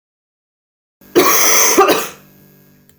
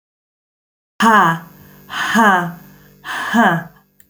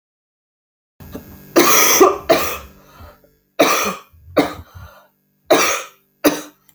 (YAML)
cough_length: 3.0 s
cough_amplitude: 32768
cough_signal_mean_std_ratio: 0.48
exhalation_length: 4.1 s
exhalation_amplitude: 29990
exhalation_signal_mean_std_ratio: 0.5
three_cough_length: 6.7 s
three_cough_amplitude: 32768
three_cough_signal_mean_std_ratio: 0.43
survey_phase: beta (2021-08-13 to 2022-03-07)
age: 18-44
gender: Female
wearing_mask: 'No'
symptom_cough_any: true
symptom_runny_or_blocked_nose: true
symptom_sore_throat: true
smoker_status: Never smoked
respiratory_condition_asthma: true
respiratory_condition_other: false
recruitment_source: Test and Trace
submission_delay: 2 days
covid_test_result: Positive
covid_test_method: LFT